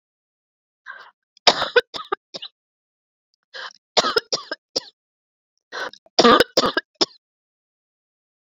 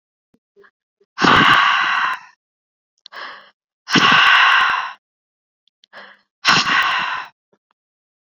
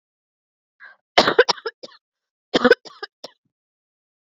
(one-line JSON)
{"three_cough_length": "8.4 s", "three_cough_amplitude": 29674, "three_cough_signal_mean_std_ratio": 0.26, "exhalation_length": "8.3 s", "exhalation_amplitude": 30795, "exhalation_signal_mean_std_ratio": 0.48, "cough_length": "4.3 s", "cough_amplitude": 29296, "cough_signal_mean_std_ratio": 0.23, "survey_phase": "beta (2021-08-13 to 2022-03-07)", "age": "45-64", "gender": "Female", "wearing_mask": "No", "symptom_none": true, "smoker_status": "Never smoked", "respiratory_condition_asthma": false, "respiratory_condition_other": false, "recruitment_source": "REACT", "submission_delay": "1 day", "covid_test_result": "Negative", "covid_test_method": "RT-qPCR"}